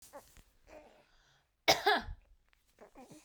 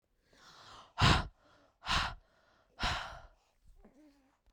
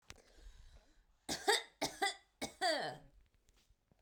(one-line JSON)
{"cough_length": "3.2 s", "cough_amplitude": 9269, "cough_signal_mean_std_ratio": 0.27, "exhalation_length": "4.5 s", "exhalation_amplitude": 7710, "exhalation_signal_mean_std_ratio": 0.33, "three_cough_length": "4.0 s", "three_cough_amplitude": 3863, "three_cough_signal_mean_std_ratio": 0.39, "survey_phase": "beta (2021-08-13 to 2022-03-07)", "age": "18-44", "gender": "Female", "wearing_mask": "No", "symptom_none": true, "symptom_onset": "7 days", "smoker_status": "Ex-smoker", "respiratory_condition_asthma": false, "respiratory_condition_other": false, "recruitment_source": "REACT", "submission_delay": "1 day", "covid_test_result": "Negative", "covid_test_method": "RT-qPCR"}